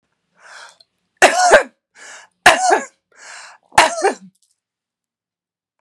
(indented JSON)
{
  "three_cough_length": "5.8 s",
  "three_cough_amplitude": 32768,
  "three_cough_signal_mean_std_ratio": 0.33,
  "survey_phase": "beta (2021-08-13 to 2022-03-07)",
  "age": "45-64",
  "gender": "Female",
  "wearing_mask": "No",
  "symptom_cough_any": true,
  "symptom_shortness_of_breath": true,
  "symptom_sore_throat": true,
  "symptom_abdominal_pain": true,
  "symptom_headache": true,
  "symptom_onset": "2 days",
  "smoker_status": "Ex-smoker",
  "respiratory_condition_asthma": false,
  "respiratory_condition_other": false,
  "recruitment_source": "Test and Trace",
  "submission_delay": "1 day",
  "covid_test_result": "Positive",
  "covid_test_method": "ePCR"
}